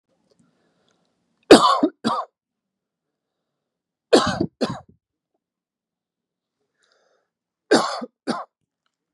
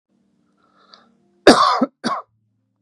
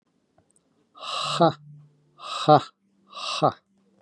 {
  "three_cough_length": "9.1 s",
  "three_cough_amplitude": 32768,
  "three_cough_signal_mean_std_ratio": 0.24,
  "cough_length": "2.8 s",
  "cough_amplitude": 32768,
  "cough_signal_mean_std_ratio": 0.3,
  "exhalation_length": "4.0 s",
  "exhalation_amplitude": 24994,
  "exhalation_signal_mean_std_ratio": 0.32,
  "survey_phase": "beta (2021-08-13 to 2022-03-07)",
  "age": "18-44",
  "gender": "Male",
  "wearing_mask": "No",
  "symptom_none": true,
  "smoker_status": "Never smoked",
  "respiratory_condition_asthma": false,
  "respiratory_condition_other": false,
  "recruitment_source": "REACT",
  "submission_delay": "3 days",
  "covid_test_result": "Negative",
  "covid_test_method": "RT-qPCR"
}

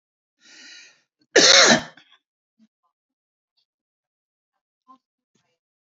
{
  "cough_length": "5.8 s",
  "cough_amplitude": 32541,
  "cough_signal_mean_std_ratio": 0.23,
  "survey_phase": "beta (2021-08-13 to 2022-03-07)",
  "age": "45-64",
  "gender": "Male",
  "wearing_mask": "No",
  "symptom_none": true,
  "smoker_status": "Never smoked",
  "respiratory_condition_asthma": false,
  "respiratory_condition_other": false,
  "recruitment_source": "REACT",
  "submission_delay": "1 day",
  "covid_test_result": "Negative",
  "covid_test_method": "RT-qPCR",
  "influenza_a_test_result": "Negative",
  "influenza_b_test_result": "Negative"
}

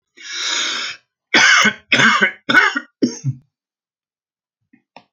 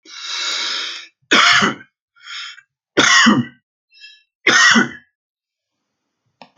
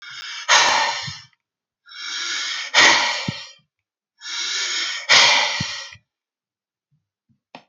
{
  "cough_length": "5.1 s",
  "cough_amplitude": 32311,
  "cough_signal_mean_std_ratio": 0.47,
  "three_cough_length": "6.6 s",
  "three_cough_amplitude": 32705,
  "three_cough_signal_mean_std_ratio": 0.44,
  "exhalation_length": "7.7 s",
  "exhalation_amplitude": 31596,
  "exhalation_signal_mean_std_ratio": 0.49,
  "survey_phase": "alpha (2021-03-01 to 2021-08-12)",
  "age": "65+",
  "gender": "Male",
  "wearing_mask": "No",
  "symptom_none": true,
  "smoker_status": "Ex-smoker",
  "respiratory_condition_asthma": false,
  "respiratory_condition_other": false,
  "recruitment_source": "REACT",
  "submission_delay": "2 days",
  "covid_test_result": "Negative",
  "covid_test_method": "RT-qPCR"
}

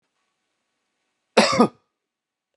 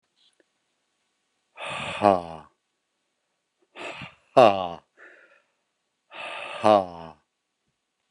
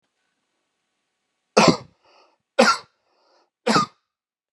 {
  "cough_length": "2.6 s",
  "cough_amplitude": 29805,
  "cough_signal_mean_std_ratio": 0.25,
  "exhalation_length": "8.1 s",
  "exhalation_amplitude": 24741,
  "exhalation_signal_mean_std_ratio": 0.24,
  "three_cough_length": "4.5 s",
  "three_cough_amplitude": 32229,
  "three_cough_signal_mean_std_ratio": 0.27,
  "survey_phase": "beta (2021-08-13 to 2022-03-07)",
  "age": "18-44",
  "gender": "Male",
  "wearing_mask": "No",
  "symptom_none": true,
  "smoker_status": "Never smoked",
  "respiratory_condition_asthma": false,
  "respiratory_condition_other": false,
  "recruitment_source": "REACT",
  "submission_delay": "1 day",
  "covid_test_result": "Negative",
  "covid_test_method": "RT-qPCR"
}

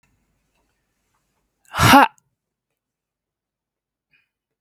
{
  "exhalation_length": "4.6 s",
  "exhalation_amplitude": 32768,
  "exhalation_signal_mean_std_ratio": 0.2,
  "survey_phase": "beta (2021-08-13 to 2022-03-07)",
  "age": "45-64",
  "gender": "Female",
  "wearing_mask": "No",
  "symptom_none": true,
  "smoker_status": "Ex-smoker",
  "respiratory_condition_asthma": false,
  "respiratory_condition_other": false,
  "recruitment_source": "REACT",
  "submission_delay": "1 day",
  "covid_test_result": "Negative",
  "covid_test_method": "RT-qPCR",
  "influenza_a_test_result": "Negative",
  "influenza_b_test_result": "Negative"
}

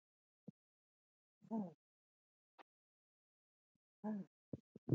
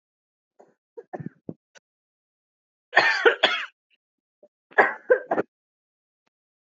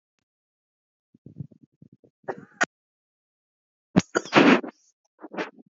{
  "exhalation_length": "4.9 s",
  "exhalation_amplitude": 2210,
  "exhalation_signal_mean_std_ratio": 0.23,
  "three_cough_length": "6.7 s",
  "three_cough_amplitude": 26336,
  "three_cough_signal_mean_std_ratio": 0.27,
  "cough_length": "5.7 s",
  "cough_amplitude": 26867,
  "cough_signal_mean_std_ratio": 0.23,
  "survey_phase": "beta (2021-08-13 to 2022-03-07)",
  "age": "18-44",
  "gender": "Female",
  "wearing_mask": "No",
  "symptom_cough_any": true,
  "symptom_new_continuous_cough": true,
  "symptom_runny_or_blocked_nose": true,
  "symptom_shortness_of_breath": true,
  "symptom_sore_throat": true,
  "symptom_fatigue": true,
  "symptom_headache": true,
  "symptom_change_to_sense_of_smell_or_taste": true,
  "symptom_onset": "2 days",
  "smoker_status": "Prefer not to say",
  "respiratory_condition_asthma": false,
  "respiratory_condition_other": false,
  "recruitment_source": "Test and Trace",
  "submission_delay": "2 days",
  "covid_test_result": "Positive",
  "covid_test_method": "RT-qPCR",
  "covid_ct_value": 33.8,
  "covid_ct_gene": "ORF1ab gene"
}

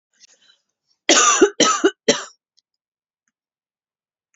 {
  "cough_length": "4.4 s",
  "cough_amplitude": 30701,
  "cough_signal_mean_std_ratio": 0.33,
  "survey_phase": "beta (2021-08-13 to 2022-03-07)",
  "age": "18-44",
  "gender": "Female",
  "wearing_mask": "No",
  "symptom_none": true,
  "smoker_status": "Never smoked",
  "respiratory_condition_asthma": false,
  "respiratory_condition_other": false,
  "recruitment_source": "Test and Trace",
  "submission_delay": "1 day",
  "covid_test_result": "Negative",
  "covid_test_method": "RT-qPCR"
}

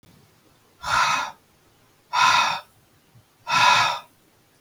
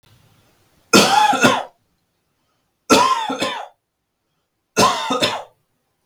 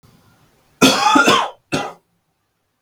{
  "exhalation_length": "4.6 s",
  "exhalation_amplitude": 20415,
  "exhalation_signal_mean_std_ratio": 0.46,
  "three_cough_length": "6.1 s",
  "three_cough_amplitude": 32768,
  "three_cough_signal_mean_std_ratio": 0.44,
  "cough_length": "2.8 s",
  "cough_amplitude": 32768,
  "cough_signal_mean_std_ratio": 0.43,
  "survey_phase": "beta (2021-08-13 to 2022-03-07)",
  "age": "18-44",
  "gender": "Male",
  "wearing_mask": "No",
  "symptom_none": true,
  "smoker_status": "Never smoked",
  "respiratory_condition_asthma": false,
  "respiratory_condition_other": false,
  "recruitment_source": "REACT",
  "submission_delay": "0 days",
  "covid_test_result": "Negative",
  "covid_test_method": "RT-qPCR",
  "influenza_a_test_result": "Negative",
  "influenza_b_test_result": "Negative"
}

